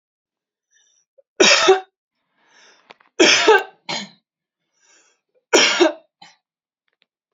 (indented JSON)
{
  "three_cough_length": "7.3 s",
  "three_cough_amplitude": 31762,
  "three_cough_signal_mean_std_ratio": 0.33,
  "survey_phase": "beta (2021-08-13 to 2022-03-07)",
  "age": "18-44",
  "gender": "Female",
  "wearing_mask": "No",
  "symptom_cough_any": true,
  "symptom_runny_or_blocked_nose": true,
  "symptom_change_to_sense_of_smell_or_taste": true,
  "symptom_onset": "12 days",
  "smoker_status": "Never smoked",
  "respiratory_condition_asthma": true,
  "respiratory_condition_other": false,
  "recruitment_source": "REACT",
  "submission_delay": "1 day",
  "covid_test_result": "Negative",
  "covid_test_method": "RT-qPCR",
  "influenza_a_test_result": "Negative",
  "influenza_b_test_result": "Negative"
}